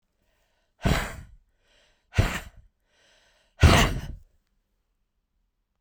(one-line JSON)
{"exhalation_length": "5.8 s", "exhalation_amplitude": 21615, "exhalation_signal_mean_std_ratio": 0.28, "survey_phase": "beta (2021-08-13 to 2022-03-07)", "age": "45-64", "gender": "Female", "wearing_mask": "No", "symptom_new_continuous_cough": true, "symptom_runny_or_blocked_nose": true, "symptom_sore_throat": true, "symptom_fatigue": true, "symptom_fever_high_temperature": true, "symptom_headache": true, "symptom_onset": "1 day", "smoker_status": "Never smoked", "respiratory_condition_asthma": false, "respiratory_condition_other": false, "recruitment_source": "Test and Trace", "submission_delay": "1 day", "covid_test_result": "Negative", "covid_test_method": "RT-qPCR"}